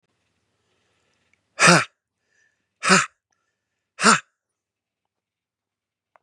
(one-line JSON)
{"exhalation_length": "6.2 s", "exhalation_amplitude": 32767, "exhalation_signal_mean_std_ratio": 0.24, "survey_phase": "beta (2021-08-13 to 2022-03-07)", "age": "45-64", "gender": "Male", "wearing_mask": "No", "symptom_none": true, "smoker_status": "Never smoked", "respiratory_condition_asthma": false, "respiratory_condition_other": false, "recruitment_source": "REACT", "submission_delay": "1 day", "covid_test_result": "Negative", "covid_test_method": "RT-qPCR", "influenza_a_test_result": "Unknown/Void", "influenza_b_test_result": "Unknown/Void"}